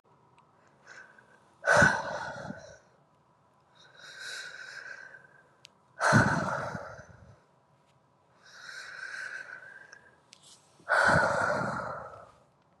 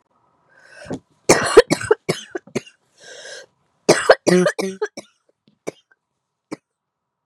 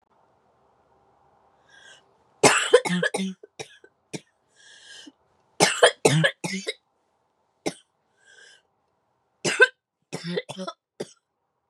{"exhalation_length": "12.8 s", "exhalation_amplitude": 11421, "exhalation_signal_mean_std_ratio": 0.4, "cough_length": "7.3 s", "cough_amplitude": 32768, "cough_signal_mean_std_ratio": 0.29, "three_cough_length": "11.7 s", "three_cough_amplitude": 31161, "three_cough_signal_mean_std_ratio": 0.29, "survey_phase": "beta (2021-08-13 to 2022-03-07)", "age": "18-44", "gender": "Female", "wearing_mask": "No", "symptom_cough_any": true, "symptom_new_continuous_cough": true, "symptom_runny_or_blocked_nose": true, "symptom_sore_throat": true, "symptom_fever_high_temperature": true, "symptom_other": true, "symptom_onset": "4 days", "smoker_status": "Never smoked", "respiratory_condition_asthma": false, "respiratory_condition_other": false, "recruitment_source": "Test and Trace", "submission_delay": "2 days", "covid_test_result": "Positive", "covid_test_method": "RT-qPCR", "covid_ct_value": 15.4, "covid_ct_gene": "ORF1ab gene", "covid_ct_mean": 15.4, "covid_viral_load": "8600000 copies/ml", "covid_viral_load_category": "High viral load (>1M copies/ml)"}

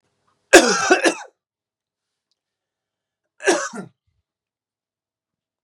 {"cough_length": "5.6 s", "cough_amplitude": 32768, "cough_signal_mean_std_ratio": 0.26, "survey_phase": "beta (2021-08-13 to 2022-03-07)", "age": "45-64", "gender": "Male", "wearing_mask": "No", "symptom_cough_any": true, "symptom_runny_or_blocked_nose": true, "symptom_sore_throat": true, "symptom_abdominal_pain": true, "symptom_fatigue": true, "symptom_change_to_sense_of_smell_or_taste": true, "smoker_status": "Never smoked", "respiratory_condition_asthma": true, "respiratory_condition_other": false, "recruitment_source": "Test and Trace", "submission_delay": "2 days", "covid_test_result": "Positive", "covid_test_method": "LFT"}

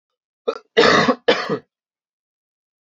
{"cough_length": "2.8 s", "cough_amplitude": 30610, "cough_signal_mean_std_ratio": 0.38, "survey_phase": "beta (2021-08-13 to 2022-03-07)", "age": "18-44", "gender": "Male", "wearing_mask": "No", "symptom_cough_any": true, "symptom_runny_or_blocked_nose": true, "symptom_sore_throat": true, "symptom_fatigue": true, "symptom_headache": true, "smoker_status": "Never smoked", "respiratory_condition_asthma": false, "respiratory_condition_other": false, "recruitment_source": "Test and Trace", "submission_delay": "3 days", "covid_test_result": "Positive", "covid_test_method": "LFT"}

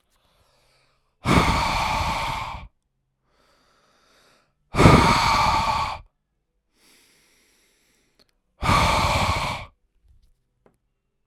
{"exhalation_length": "11.3 s", "exhalation_amplitude": 32768, "exhalation_signal_mean_std_ratio": 0.43, "survey_phase": "alpha (2021-03-01 to 2021-08-12)", "age": "45-64", "gender": "Male", "wearing_mask": "No", "symptom_none": true, "smoker_status": "Ex-smoker", "respiratory_condition_asthma": false, "respiratory_condition_other": false, "recruitment_source": "REACT", "submission_delay": "3 days", "covid_test_result": "Negative", "covid_test_method": "RT-qPCR"}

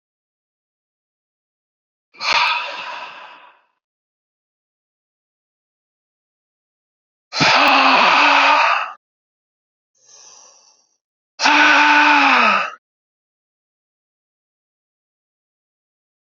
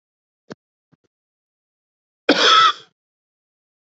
{"exhalation_length": "16.2 s", "exhalation_amplitude": 28211, "exhalation_signal_mean_std_ratio": 0.38, "cough_length": "3.8 s", "cough_amplitude": 27971, "cough_signal_mean_std_ratio": 0.27, "survey_phase": "alpha (2021-03-01 to 2021-08-12)", "age": "18-44", "gender": "Male", "wearing_mask": "No", "symptom_cough_any": true, "symptom_new_continuous_cough": true, "symptom_shortness_of_breath": true, "symptom_fatigue": true, "symptom_fever_high_temperature": true, "symptom_onset": "3 days", "smoker_status": "Never smoked", "respiratory_condition_asthma": false, "respiratory_condition_other": false, "recruitment_source": "Test and Trace", "submission_delay": "1 day", "covid_test_result": "Positive", "covid_test_method": "RT-qPCR"}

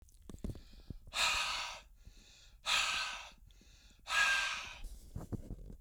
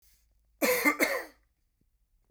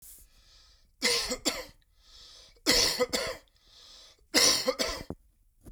{"exhalation_length": "5.8 s", "exhalation_amplitude": 4017, "exhalation_signal_mean_std_ratio": 0.58, "cough_length": "2.3 s", "cough_amplitude": 9131, "cough_signal_mean_std_ratio": 0.39, "three_cough_length": "5.7 s", "three_cough_amplitude": 13212, "three_cough_signal_mean_std_ratio": 0.45, "survey_phase": "beta (2021-08-13 to 2022-03-07)", "age": "45-64", "gender": "Male", "wearing_mask": "No", "symptom_none": true, "smoker_status": "Never smoked", "respiratory_condition_asthma": false, "respiratory_condition_other": false, "recruitment_source": "REACT", "submission_delay": "1 day", "covid_test_result": "Negative", "covid_test_method": "RT-qPCR"}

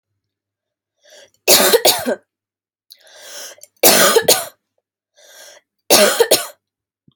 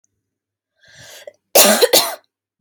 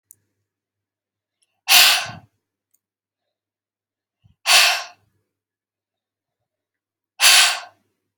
{"three_cough_length": "7.2 s", "three_cough_amplitude": 32768, "three_cough_signal_mean_std_ratio": 0.38, "cough_length": "2.6 s", "cough_amplitude": 32768, "cough_signal_mean_std_ratio": 0.35, "exhalation_length": "8.2 s", "exhalation_amplitude": 32768, "exhalation_signal_mean_std_ratio": 0.28, "survey_phase": "alpha (2021-03-01 to 2021-08-12)", "age": "18-44", "gender": "Female", "wearing_mask": "No", "symptom_none": true, "smoker_status": "Never smoked", "respiratory_condition_asthma": false, "respiratory_condition_other": false, "recruitment_source": "REACT", "submission_delay": "2 days", "covid_test_result": "Negative", "covid_test_method": "RT-qPCR"}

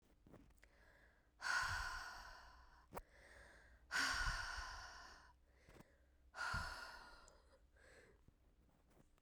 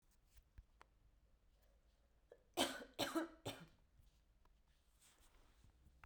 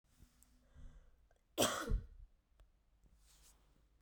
{"exhalation_length": "9.2 s", "exhalation_amplitude": 1297, "exhalation_signal_mean_std_ratio": 0.49, "three_cough_length": "6.1 s", "three_cough_amplitude": 2811, "three_cough_signal_mean_std_ratio": 0.31, "cough_length": "4.0 s", "cough_amplitude": 4624, "cough_signal_mean_std_ratio": 0.31, "survey_phase": "beta (2021-08-13 to 2022-03-07)", "age": "18-44", "gender": "Female", "wearing_mask": "No", "symptom_cough_any": true, "symptom_runny_or_blocked_nose": true, "symptom_sore_throat": true, "symptom_fatigue": true, "symptom_headache": true, "symptom_change_to_sense_of_smell_or_taste": true, "symptom_loss_of_taste": true, "symptom_other": true, "symptom_onset": "3 days", "smoker_status": "Never smoked", "respiratory_condition_asthma": true, "respiratory_condition_other": false, "recruitment_source": "Test and Trace", "submission_delay": "2 days", "covid_test_result": "Positive", "covid_test_method": "RT-qPCR", "covid_ct_value": 12.0, "covid_ct_gene": "ORF1ab gene"}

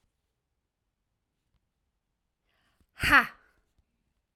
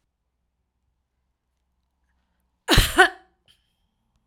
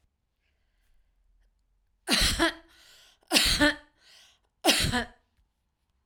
{"exhalation_length": "4.4 s", "exhalation_amplitude": 16417, "exhalation_signal_mean_std_ratio": 0.16, "cough_length": "4.3 s", "cough_amplitude": 32235, "cough_signal_mean_std_ratio": 0.21, "three_cough_length": "6.1 s", "three_cough_amplitude": 16307, "three_cough_signal_mean_std_ratio": 0.37, "survey_phase": "alpha (2021-03-01 to 2021-08-12)", "age": "45-64", "gender": "Female", "wearing_mask": "No", "symptom_none": true, "smoker_status": "Never smoked", "respiratory_condition_asthma": false, "respiratory_condition_other": false, "recruitment_source": "REACT", "submission_delay": "1 day", "covid_test_result": "Negative", "covid_test_method": "RT-qPCR"}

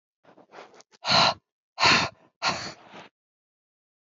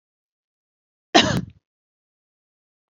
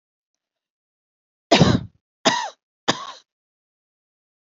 {"exhalation_length": "4.2 s", "exhalation_amplitude": 15503, "exhalation_signal_mean_std_ratio": 0.35, "cough_length": "2.9 s", "cough_amplitude": 29804, "cough_signal_mean_std_ratio": 0.21, "three_cough_length": "4.5 s", "three_cough_amplitude": 28982, "three_cough_signal_mean_std_ratio": 0.26, "survey_phase": "beta (2021-08-13 to 2022-03-07)", "age": "45-64", "gender": "Female", "wearing_mask": "No", "symptom_sore_throat": true, "smoker_status": "Never smoked", "respiratory_condition_asthma": false, "respiratory_condition_other": false, "recruitment_source": "Test and Trace", "submission_delay": "1 day", "covid_test_result": "Positive", "covid_test_method": "RT-qPCR", "covid_ct_value": 36.1, "covid_ct_gene": "ORF1ab gene"}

